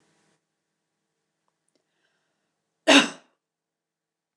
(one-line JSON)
{"cough_length": "4.4 s", "cough_amplitude": 25473, "cough_signal_mean_std_ratio": 0.16, "survey_phase": "beta (2021-08-13 to 2022-03-07)", "age": "45-64", "gender": "Female", "wearing_mask": "No", "symptom_none": true, "smoker_status": "Never smoked", "respiratory_condition_asthma": false, "respiratory_condition_other": false, "recruitment_source": "REACT", "submission_delay": "1 day", "covid_test_result": "Negative", "covid_test_method": "RT-qPCR"}